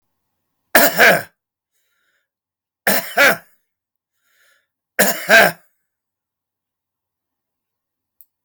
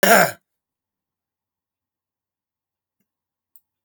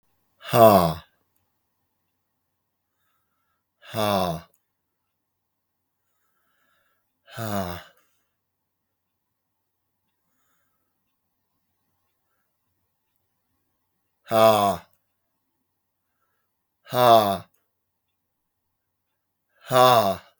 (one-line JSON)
{"three_cough_length": "8.4 s", "three_cough_amplitude": 32768, "three_cough_signal_mean_std_ratio": 0.3, "cough_length": "3.8 s", "cough_amplitude": 24004, "cough_signal_mean_std_ratio": 0.2, "exhalation_length": "20.4 s", "exhalation_amplitude": 30316, "exhalation_signal_mean_std_ratio": 0.25, "survey_phase": "beta (2021-08-13 to 2022-03-07)", "age": "65+", "gender": "Male", "wearing_mask": "No", "symptom_none": true, "smoker_status": "Never smoked", "respiratory_condition_asthma": true, "respiratory_condition_other": false, "recruitment_source": "REACT", "submission_delay": "2 days", "covid_test_result": "Negative", "covid_test_method": "RT-qPCR", "influenza_a_test_result": "Negative", "influenza_b_test_result": "Negative"}